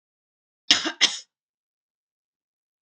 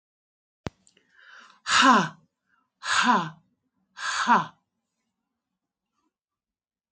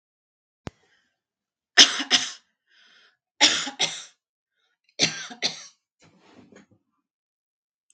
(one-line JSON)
{"cough_length": "2.8 s", "cough_amplitude": 32767, "cough_signal_mean_std_ratio": 0.22, "exhalation_length": "6.9 s", "exhalation_amplitude": 17111, "exhalation_signal_mean_std_ratio": 0.32, "three_cough_length": "7.9 s", "three_cough_amplitude": 32767, "three_cough_signal_mean_std_ratio": 0.24, "survey_phase": "beta (2021-08-13 to 2022-03-07)", "age": "45-64", "gender": "Female", "wearing_mask": "No", "symptom_none": true, "smoker_status": "Never smoked", "respiratory_condition_asthma": false, "respiratory_condition_other": false, "recruitment_source": "REACT", "submission_delay": "2 days", "covid_test_result": "Negative", "covid_test_method": "RT-qPCR", "influenza_a_test_result": "Negative", "influenza_b_test_result": "Negative"}